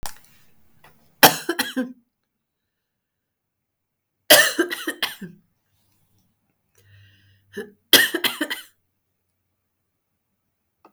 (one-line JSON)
{"three_cough_length": "10.9 s", "three_cough_amplitude": 32768, "three_cough_signal_mean_std_ratio": 0.24, "survey_phase": "beta (2021-08-13 to 2022-03-07)", "age": "45-64", "gender": "Female", "wearing_mask": "No", "symptom_cough_any": true, "symptom_onset": "7 days", "smoker_status": "Ex-smoker", "respiratory_condition_asthma": false, "respiratory_condition_other": false, "recruitment_source": "REACT", "submission_delay": "1 day", "covid_test_result": "Negative", "covid_test_method": "RT-qPCR", "influenza_a_test_result": "Negative", "influenza_b_test_result": "Negative"}